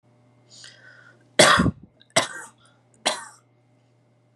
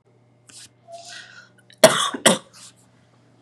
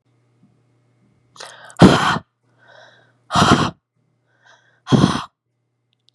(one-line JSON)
{"three_cough_length": "4.4 s", "three_cough_amplitude": 29605, "three_cough_signal_mean_std_ratio": 0.28, "cough_length": "3.4 s", "cough_amplitude": 32768, "cough_signal_mean_std_ratio": 0.26, "exhalation_length": "6.1 s", "exhalation_amplitude": 32768, "exhalation_signal_mean_std_ratio": 0.31, "survey_phase": "beta (2021-08-13 to 2022-03-07)", "age": "18-44", "gender": "Female", "wearing_mask": "No", "symptom_none": true, "smoker_status": "Never smoked", "respiratory_condition_asthma": false, "respiratory_condition_other": false, "recruitment_source": "REACT", "submission_delay": "1 day", "covid_test_result": "Negative", "covid_test_method": "RT-qPCR", "influenza_a_test_result": "Negative", "influenza_b_test_result": "Negative"}